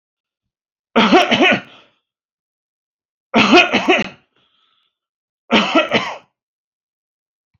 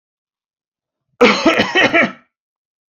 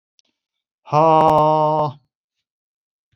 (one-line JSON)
{"three_cough_length": "7.6 s", "three_cough_amplitude": 31779, "three_cough_signal_mean_std_ratio": 0.38, "cough_length": "2.9 s", "cough_amplitude": 31636, "cough_signal_mean_std_ratio": 0.42, "exhalation_length": "3.2 s", "exhalation_amplitude": 26241, "exhalation_signal_mean_std_ratio": 0.45, "survey_phase": "beta (2021-08-13 to 2022-03-07)", "age": "65+", "gender": "Male", "wearing_mask": "No", "symptom_cough_any": true, "smoker_status": "Never smoked", "respiratory_condition_asthma": false, "respiratory_condition_other": false, "recruitment_source": "REACT", "submission_delay": "1 day", "covid_test_result": "Negative", "covid_test_method": "RT-qPCR"}